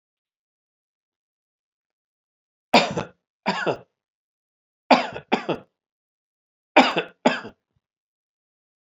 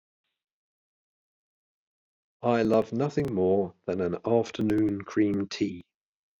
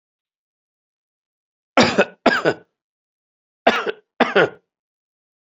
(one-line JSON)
{"three_cough_length": "8.9 s", "three_cough_amplitude": 32768, "three_cough_signal_mean_std_ratio": 0.25, "exhalation_length": "6.4 s", "exhalation_amplitude": 9283, "exhalation_signal_mean_std_ratio": 0.53, "cough_length": "5.5 s", "cough_amplitude": 32767, "cough_signal_mean_std_ratio": 0.3, "survey_phase": "beta (2021-08-13 to 2022-03-07)", "age": "45-64", "gender": "Male", "wearing_mask": "No", "symptom_none": true, "smoker_status": "Never smoked", "respiratory_condition_asthma": false, "respiratory_condition_other": false, "recruitment_source": "REACT", "submission_delay": "2 days", "covid_test_result": "Negative", "covid_test_method": "RT-qPCR", "influenza_a_test_result": "Negative", "influenza_b_test_result": "Negative"}